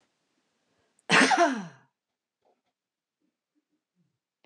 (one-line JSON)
{"cough_length": "4.5 s", "cough_amplitude": 14307, "cough_signal_mean_std_ratio": 0.26, "survey_phase": "beta (2021-08-13 to 2022-03-07)", "age": "65+", "gender": "Female", "wearing_mask": "No", "symptom_runny_or_blocked_nose": true, "smoker_status": "Ex-smoker", "respiratory_condition_asthma": false, "respiratory_condition_other": false, "recruitment_source": "REACT", "submission_delay": "3 days", "covid_test_result": "Negative", "covid_test_method": "RT-qPCR", "influenza_a_test_result": "Negative", "influenza_b_test_result": "Negative"}